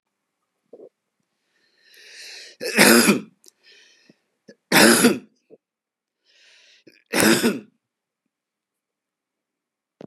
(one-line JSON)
{"three_cough_length": "10.1 s", "three_cough_amplitude": 32768, "three_cough_signal_mean_std_ratio": 0.29, "survey_phase": "beta (2021-08-13 to 2022-03-07)", "age": "45-64", "gender": "Male", "wearing_mask": "No", "symptom_cough_any": true, "symptom_sore_throat": true, "symptom_fatigue": true, "symptom_onset": "3 days", "smoker_status": "Never smoked", "respiratory_condition_asthma": false, "respiratory_condition_other": false, "recruitment_source": "Test and Trace", "submission_delay": "2 days", "covid_test_result": "Positive", "covid_test_method": "RT-qPCR", "covid_ct_value": 16.9, "covid_ct_gene": "ORF1ab gene", "covid_ct_mean": 17.2, "covid_viral_load": "2300000 copies/ml", "covid_viral_load_category": "High viral load (>1M copies/ml)"}